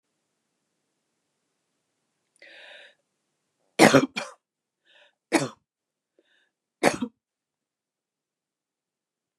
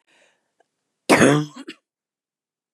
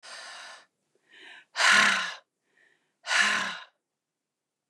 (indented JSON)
{
  "three_cough_length": "9.4 s",
  "three_cough_amplitude": 29204,
  "three_cough_signal_mean_std_ratio": 0.18,
  "cough_length": "2.7 s",
  "cough_amplitude": 28745,
  "cough_signal_mean_std_ratio": 0.29,
  "exhalation_length": "4.7 s",
  "exhalation_amplitude": 13947,
  "exhalation_signal_mean_std_ratio": 0.38,
  "survey_phase": "beta (2021-08-13 to 2022-03-07)",
  "age": "65+",
  "gender": "Female",
  "wearing_mask": "No",
  "symptom_none": true,
  "smoker_status": "Never smoked",
  "respiratory_condition_asthma": false,
  "respiratory_condition_other": false,
  "recruitment_source": "REACT",
  "submission_delay": "2 days",
  "covid_test_result": "Negative",
  "covid_test_method": "RT-qPCR",
  "influenza_a_test_result": "Negative",
  "influenza_b_test_result": "Negative"
}